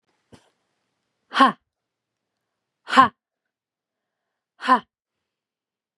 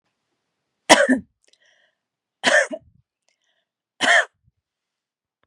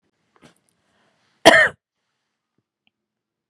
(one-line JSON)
{"exhalation_length": "6.0 s", "exhalation_amplitude": 32758, "exhalation_signal_mean_std_ratio": 0.2, "three_cough_length": "5.5 s", "three_cough_amplitude": 32768, "three_cough_signal_mean_std_ratio": 0.28, "cough_length": "3.5 s", "cough_amplitude": 32768, "cough_signal_mean_std_ratio": 0.19, "survey_phase": "beta (2021-08-13 to 2022-03-07)", "age": "18-44", "gender": "Female", "wearing_mask": "No", "symptom_fatigue": true, "symptom_headache": true, "symptom_onset": "4 days", "smoker_status": "Ex-smoker", "respiratory_condition_asthma": false, "respiratory_condition_other": false, "recruitment_source": "REACT", "submission_delay": "1 day", "covid_test_result": "Negative", "covid_test_method": "RT-qPCR", "influenza_a_test_result": "Negative", "influenza_b_test_result": "Negative"}